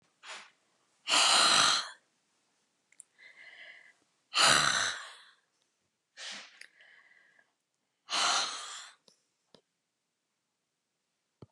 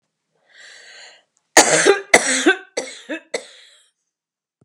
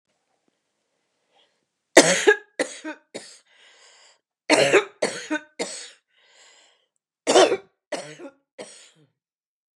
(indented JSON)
{
  "exhalation_length": "11.5 s",
  "exhalation_amplitude": 10392,
  "exhalation_signal_mean_std_ratio": 0.34,
  "cough_length": "4.6 s",
  "cough_amplitude": 32768,
  "cough_signal_mean_std_ratio": 0.34,
  "three_cough_length": "9.8 s",
  "three_cough_amplitude": 32768,
  "three_cough_signal_mean_std_ratio": 0.29,
  "survey_phase": "beta (2021-08-13 to 2022-03-07)",
  "age": "65+",
  "gender": "Female",
  "wearing_mask": "No",
  "symptom_none": true,
  "smoker_status": "Never smoked",
  "respiratory_condition_asthma": true,
  "respiratory_condition_other": false,
  "recruitment_source": "REACT",
  "submission_delay": "6 days",
  "covid_test_result": "Negative",
  "covid_test_method": "RT-qPCR",
  "influenza_a_test_result": "Negative",
  "influenza_b_test_result": "Negative"
}